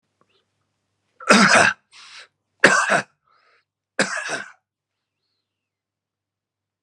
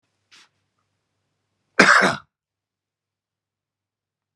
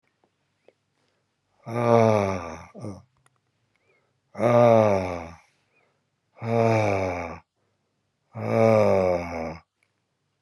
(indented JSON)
{
  "three_cough_length": "6.8 s",
  "three_cough_amplitude": 32767,
  "three_cough_signal_mean_std_ratio": 0.3,
  "cough_length": "4.4 s",
  "cough_amplitude": 32767,
  "cough_signal_mean_std_ratio": 0.22,
  "exhalation_length": "10.4 s",
  "exhalation_amplitude": 19810,
  "exhalation_signal_mean_std_ratio": 0.43,
  "survey_phase": "beta (2021-08-13 to 2022-03-07)",
  "age": "65+",
  "gender": "Male",
  "wearing_mask": "No",
  "symptom_none": true,
  "smoker_status": "Never smoked",
  "respiratory_condition_asthma": false,
  "respiratory_condition_other": false,
  "recruitment_source": "REACT",
  "submission_delay": "1 day",
  "covid_test_result": "Negative",
  "covid_test_method": "RT-qPCR"
}